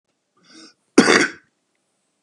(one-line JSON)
{"cough_length": "2.2 s", "cough_amplitude": 32768, "cough_signal_mean_std_ratio": 0.28, "survey_phase": "beta (2021-08-13 to 2022-03-07)", "age": "45-64", "gender": "Male", "wearing_mask": "No", "symptom_runny_or_blocked_nose": true, "smoker_status": "Current smoker (11 or more cigarettes per day)", "respiratory_condition_asthma": false, "respiratory_condition_other": false, "recruitment_source": "Test and Trace", "submission_delay": "1 day", "covid_test_result": "Positive", "covid_test_method": "LFT"}